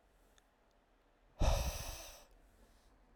{"exhalation_length": "3.2 s", "exhalation_amplitude": 3150, "exhalation_signal_mean_std_ratio": 0.34, "survey_phase": "alpha (2021-03-01 to 2021-08-12)", "age": "18-44", "gender": "Male", "wearing_mask": "No", "symptom_shortness_of_breath": true, "symptom_change_to_sense_of_smell_or_taste": true, "symptom_loss_of_taste": true, "symptom_onset": "3 days", "smoker_status": "Ex-smoker", "respiratory_condition_asthma": false, "respiratory_condition_other": false, "recruitment_source": "Test and Trace", "submission_delay": "2 days", "covid_test_result": "Positive", "covid_test_method": "RT-qPCR", "covid_ct_value": 10.4, "covid_ct_gene": "N gene", "covid_ct_mean": 10.5, "covid_viral_load": "360000000 copies/ml", "covid_viral_load_category": "High viral load (>1M copies/ml)"}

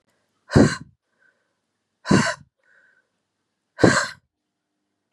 {"exhalation_length": "5.1 s", "exhalation_amplitude": 31365, "exhalation_signal_mean_std_ratio": 0.27, "survey_phase": "beta (2021-08-13 to 2022-03-07)", "age": "18-44", "gender": "Female", "wearing_mask": "No", "symptom_cough_any": true, "symptom_runny_or_blocked_nose": true, "symptom_shortness_of_breath": true, "symptom_sore_throat": true, "symptom_abdominal_pain": true, "symptom_fatigue": true, "symptom_headache": true, "symptom_change_to_sense_of_smell_or_taste": true, "symptom_loss_of_taste": true, "symptom_onset": "6 days", "smoker_status": "Never smoked", "respiratory_condition_asthma": false, "respiratory_condition_other": false, "recruitment_source": "Test and Trace", "submission_delay": "1 day", "covid_test_result": "Positive", "covid_test_method": "RT-qPCR", "covid_ct_value": 16.6, "covid_ct_gene": "ORF1ab gene", "covid_ct_mean": 17.1, "covid_viral_load": "2400000 copies/ml", "covid_viral_load_category": "High viral load (>1M copies/ml)"}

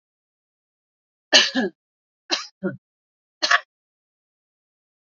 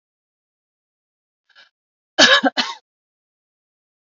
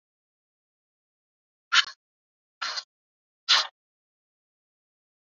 {"three_cough_length": "5.0 s", "three_cough_amplitude": 32768, "three_cough_signal_mean_std_ratio": 0.25, "cough_length": "4.2 s", "cough_amplitude": 32341, "cough_signal_mean_std_ratio": 0.23, "exhalation_length": "5.2 s", "exhalation_amplitude": 21207, "exhalation_signal_mean_std_ratio": 0.2, "survey_phase": "beta (2021-08-13 to 2022-03-07)", "age": "45-64", "gender": "Female", "wearing_mask": "No", "symptom_none": true, "smoker_status": "Never smoked", "respiratory_condition_asthma": false, "respiratory_condition_other": false, "recruitment_source": "Test and Trace", "submission_delay": "1 day", "covid_test_result": "Negative", "covid_test_method": "RT-qPCR"}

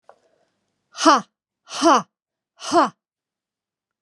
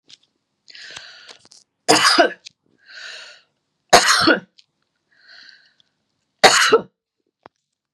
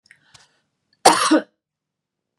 {"exhalation_length": "4.0 s", "exhalation_amplitude": 28138, "exhalation_signal_mean_std_ratio": 0.31, "three_cough_length": "7.9 s", "three_cough_amplitude": 32768, "three_cough_signal_mean_std_ratio": 0.32, "cough_length": "2.4 s", "cough_amplitude": 32768, "cough_signal_mean_std_ratio": 0.28, "survey_phase": "beta (2021-08-13 to 2022-03-07)", "age": "45-64", "gender": "Female", "wearing_mask": "No", "symptom_none": true, "smoker_status": "Never smoked", "respiratory_condition_asthma": false, "respiratory_condition_other": false, "recruitment_source": "Test and Trace", "submission_delay": "1 day", "covid_test_result": "Negative", "covid_test_method": "RT-qPCR"}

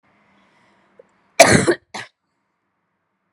{"cough_length": "3.3 s", "cough_amplitude": 32768, "cough_signal_mean_std_ratio": 0.24, "survey_phase": "beta (2021-08-13 to 2022-03-07)", "age": "18-44", "gender": "Female", "wearing_mask": "No", "symptom_cough_any": true, "symptom_new_continuous_cough": true, "symptom_runny_or_blocked_nose": true, "symptom_sore_throat": true, "symptom_fatigue": true, "symptom_fever_high_temperature": true, "symptom_headache": true, "symptom_change_to_sense_of_smell_or_taste": true, "symptom_loss_of_taste": true, "symptom_onset": "6 days", "smoker_status": "Never smoked", "respiratory_condition_asthma": false, "respiratory_condition_other": false, "recruitment_source": "Test and Trace", "submission_delay": "1 day", "covid_test_result": "Positive", "covid_test_method": "RT-qPCR", "covid_ct_value": 22.3, "covid_ct_gene": "ORF1ab gene"}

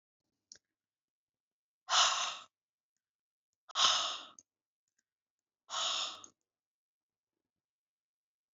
{"exhalation_length": "8.5 s", "exhalation_amplitude": 6094, "exhalation_signal_mean_std_ratio": 0.29, "survey_phase": "beta (2021-08-13 to 2022-03-07)", "age": "65+", "gender": "Female", "wearing_mask": "No", "symptom_none": true, "smoker_status": "Ex-smoker", "respiratory_condition_asthma": false, "respiratory_condition_other": false, "recruitment_source": "REACT", "submission_delay": "2 days", "covid_test_result": "Negative", "covid_test_method": "RT-qPCR"}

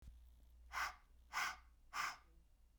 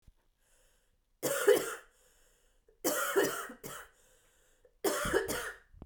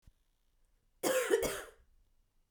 {"exhalation_length": "2.8 s", "exhalation_amplitude": 1452, "exhalation_signal_mean_std_ratio": 0.5, "three_cough_length": "5.9 s", "three_cough_amplitude": 8470, "three_cough_signal_mean_std_ratio": 0.43, "cough_length": "2.5 s", "cough_amplitude": 5338, "cough_signal_mean_std_ratio": 0.39, "survey_phase": "beta (2021-08-13 to 2022-03-07)", "age": "45-64", "gender": "Female", "wearing_mask": "No", "symptom_cough_any": true, "symptom_fatigue": true, "symptom_fever_high_temperature": true, "symptom_change_to_sense_of_smell_or_taste": true, "symptom_onset": "2 days", "smoker_status": "Never smoked", "respiratory_condition_asthma": true, "respiratory_condition_other": false, "recruitment_source": "Test and Trace", "submission_delay": "2 days", "covid_test_result": "Positive", "covid_test_method": "RT-qPCR", "covid_ct_value": 15.7, "covid_ct_gene": "ORF1ab gene", "covid_ct_mean": 16.0, "covid_viral_load": "5400000 copies/ml", "covid_viral_load_category": "High viral load (>1M copies/ml)"}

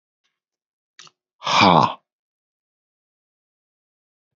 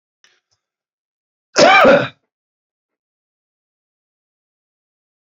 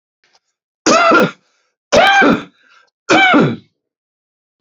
{"exhalation_length": "4.4 s", "exhalation_amplitude": 27757, "exhalation_signal_mean_std_ratio": 0.24, "cough_length": "5.2 s", "cough_amplitude": 29395, "cough_signal_mean_std_ratio": 0.25, "three_cough_length": "4.6 s", "three_cough_amplitude": 29933, "three_cough_signal_mean_std_ratio": 0.48, "survey_phase": "beta (2021-08-13 to 2022-03-07)", "age": "45-64", "gender": "Male", "wearing_mask": "No", "symptom_cough_any": true, "symptom_runny_or_blocked_nose": true, "symptom_sore_throat": true, "symptom_diarrhoea": true, "symptom_fatigue": true, "smoker_status": "Current smoker (e-cigarettes or vapes only)", "respiratory_condition_asthma": false, "respiratory_condition_other": false, "recruitment_source": "Test and Trace", "submission_delay": "2 days", "covid_test_result": "Positive", "covid_test_method": "LFT"}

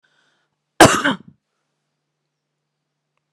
{"cough_length": "3.3 s", "cough_amplitude": 32768, "cough_signal_mean_std_ratio": 0.2, "survey_phase": "alpha (2021-03-01 to 2021-08-12)", "age": "45-64", "gender": "Female", "wearing_mask": "No", "symptom_none": true, "smoker_status": "Never smoked", "respiratory_condition_asthma": false, "respiratory_condition_other": false, "recruitment_source": "REACT", "submission_delay": "2 days", "covid_test_result": "Negative", "covid_test_method": "RT-qPCR"}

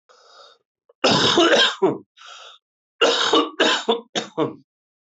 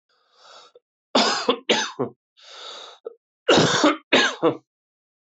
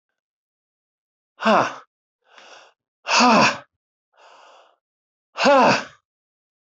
{"three_cough_length": "5.1 s", "three_cough_amplitude": 19584, "three_cough_signal_mean_std_ratio": 0.52, "cough_length": "5.4 s", "cough_amplitude": 19535, "cough_signal_mean_std_ratio": 0.43, "exhalation_length": "6.7 s", "exhalation_amplitude": 20654, "exhalation_signal_mean_std_ratio": 0.35, "survey_phase": "alpha (2021-03-01 to 2021-08-12)", "age": "45-64", "gender": "Male", "wearing_mask": "No", "symptom_cough_any": true, "symptom_fatigue": true, "symptom_headache": true, "symptom_onset": "6 days", "smoker_status": "Never smoked", "respiratory_condition_asthma": true, "respiratory_condition_other": false, "recruitment_source": "Test and Trace", "submission_delay": "1 day", "covid_test_result": "Positive", "covid_test_method": "RT-qPCR", "covid_ct_value": 10.9, "covid_ct_gene": "ORF1ab gene", "covid_ct_mean": 11.1, "covid_viral_load": "220000000 copies/ml", "covid_viral_load_category": "High viral load (>1M copies/ml)"}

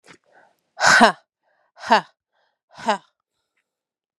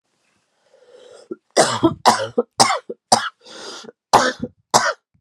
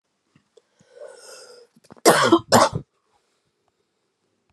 {"exhalation_length": "4.2 s", "exhalation_amplitude": 32767, "exhalation_signal_mean_std_ratio": 0.27, "three_cough_length": "5.2 s", "three_cough_amplitude": 32768, "three_cough_signal_mean_std_ratio": 0.39, "cough_length": "4.5 s", "cough_amplitude": 32112, "cough_signal_mean_std_ratio": 0.28, "survey_phase": "beta (2021-08-13 to 2022-03-07)", "age": "18-44", "gender": "Female", "wearing_mask": "No", "symptom_cough_any": true, "symptom_new_continuous_cough": true, "symptom_runny_or_blocked_nose": true, "symptom_shortness_of_breath": true, "symptom_sore_throat": true, "symptom_fatigue": true, "symptom_headache": true, "symptom_onset": "3 days", "smoker_status": "Never smoked", "respiratory_condition_asthma": false, "respiratory_condition_other": false, "recruitment_source": "Test and Trace", "submission_delay": "2 days", "covid_test_result": "Positive", "covid_test_method": "RT-qPCR", "covid_ct_value": 15.1, "covid_ct_gene": "ORF1ab gene", "covid_ct_mean": 15.5, "covid_viral_load": "7900000 copies/ml", "covid_viral_load_category": "High viral load (>1M copies/ml)"}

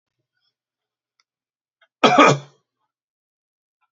{"cough_length": "3.9 s", "cough_amplitude": 32768, "cough_signal_mean_std_ratio": 0.22, "survey_phase": "beta (2021-08-13 to 2022-03-07)", "age": "65+", "gender": "Male", "wearing_mask": "No", "symptom_none": true, "smoker_status": "Ex-smoker", "respiratory_condition_asthma": false, "respiratory_condition_other": false, "recruitment_source": "REACT", "submission_delay": "1 day", "covid_test_result": "Negative", "covid_test_method": "RT-qPCR"}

